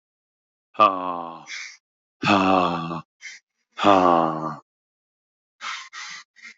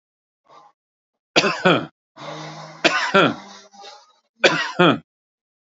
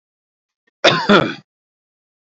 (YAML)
exhalation_length: 6.6 s
exhalation_amplitude: 26866
exhalation_signal_mean_std_ratio: 0.41
three_cough_length: 5.6 s
three_cough_amplitude: 30221
three_cough_signal_mean_std_ratio: 0.38
cough_length: 2.2 s
cough_amplitude: 29862
cough_signal_mean_std_ratio: 0.33
survey_phase: alpha (2021-03-01 to 2021-08-12)
age: 45-64
gender: Male
wearing_mask: 'No'
symptom_none: true
smoker_status: Never smoked
respiratory_condition_asthma: false
respiratory_condition_other: false
recruitment_source: REACT
submission_delay: 1 day
covid_test_result: Negative
covid_test_method: RT-qPCR